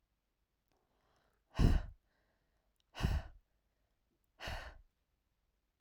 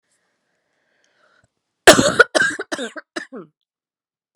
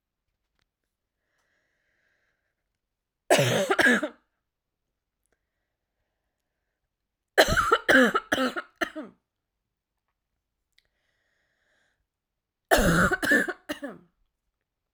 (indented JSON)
{
  "exhalation_length": "5.8 s",
  "exhalation_amplitude": 4770,
  "exhalation_signal_mean_std_ratio": 0.25,
  "cough_length": "4.4 s",
  "cough_amplitude": 32768,
  "cough_signal_mean_std_ratio": 0.26,
  "three_cough_length": "14.9 s",
  "three_cough_amplitude": 23756,
  "three_cough_signal_mean_std_ratio": 0.31,
  "survey_phase": "alpha (2021-03-01 to 2021-08-12)",
  "age": "18-44",
  "gender": "Female",
  "wearing_mask": "No",
  "symptom_fatigue": true,
  "symptom_headache": true,
  "symptom_onset": "10 days",
  "smoker_status": "Ex-smoker",
  "respiratory_condition_asthma": false,
  "respiratory_condition_other": false,
  "recruitment_source": "REACT",
  "submission_delay": "2 days",
  "covid_test_result": "Negative",
  "covid_test_method": "RT-qPCR"
}